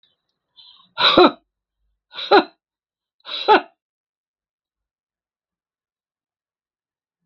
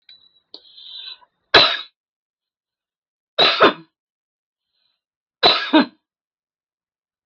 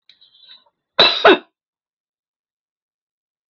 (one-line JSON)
{"exhalation_length": "7.3 s", "exhalation_amplitude": 32768, "exhalation_signal_mean_std_ratio": 0.23, "three_cough_length": "7.3 s", "three_cough_amplitude": 32768, "three_cough_signal_mean_std_ratio": 0.28, "cough_length": "3.5 s", "cough_amplitude": 32766, "cough_signal_mean_std_ratio": 0.24, "survey_phase": "beta (2021-08-13 to 2022-03-07)", "age": "65+", "gender": "Female", "wearing_mask": "No", "symptom_none": true, "smoker_status": "Never smoked", "respiratory_condition_asthma": false, "respiratory_condition_other": false, "recruitment_source": "REACT", "submission_delay": "2 days", "covid_test_result": "Negative", "covid_test_method": "RT-qPCR"}